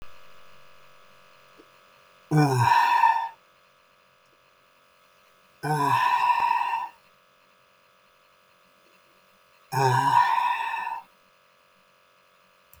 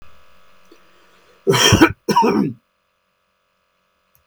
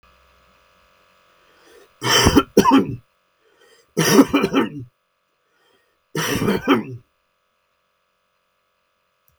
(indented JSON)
{
  "exhalation_length": "12.8 s",
  "exhalation_amplitude": 14332,
  "exhalation_signal_mean_std_ratio": 0.46,
  "cough_length": "4.3 s",
  "cough_amplitude": 32766,
  "cough_signal_mean_std_ratio": 0.37,
  "three_cough_length": "9.4 s",
  "three_cough_amplitude": 32766,
  "three_cough_signal_mean_std_ratio": 0.35,
  "survey_phase": "beta (2021-08-13 to 2022-03-07)",
  "age": "65+",
  "gender": "Male",
  "wearing_mask": "No",
  "symptom_none": true,
  "smoker_status": "Ex-smoker",
  "respiratory_condition_asthma": false,
  "respiratory_condition_other": false,
  "recruitment_source": "Test and Trace",
  "submission_delay": "0 days",
  "covid_test_result": "Negative",
  "covid_test_method": "LFT"
}